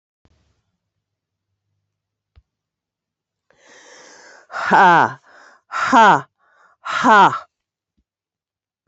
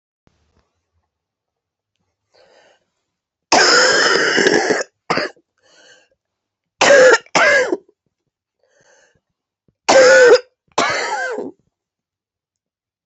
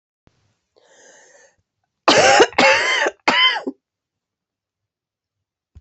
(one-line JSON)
{"exhalation_length": "8.9 s", "exhalation_amplitude": 28269, "exhalation_signal_mean_std_ratio": 0.31, "three_cough_length": "13.1 s", "three_cough_amplitude": 30815, "three_cough_signal_mean_std_ratio": 0.4, "cough_length": "5.8 s", "cough_amplitude": 29329, "cough_signal_mean_std_ratio": 0.37, "survey_phase": "beta (2021-08-13 to 2022-03-07)", "age": "65+", "gender": "Female", "wearing_mask": "No", "symptom_cough_any": true, "symptom_runny_or_blocked_nose": true, "symptom_shortness_of_breath": true, "symptom_fatigue": true, "symptom_headache": true, "symptom_onset": "2 days", "smoker_status": "Never smoked", "respiratory_condition_asthma": true, "respiratory_condition_other": false, "recruitment_source": "Test and Trace", "submission_delay": "1 day", "covid_test_result": "Positive", "covid_test_method": "ePCR"}